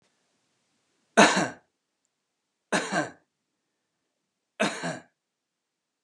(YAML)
three_cough_length: 6.0 s
three_cough_amplitude: 23537
three_cough_signal_mean_std_ratio: 0.26
survey_phase: beta (2021-08-13 to 2022-03-07)
age: 65+
gender: Male
wearing_mask: 'No'
symptom_cough_any: true
smoker_status: Never smoked
respiratory_condition_asthma: false
respiratory_condition_other: false
recruitment_source: REACT
submission_delay: 6 days
covid_test_result: Negative
covid_test_method: RT-qPCR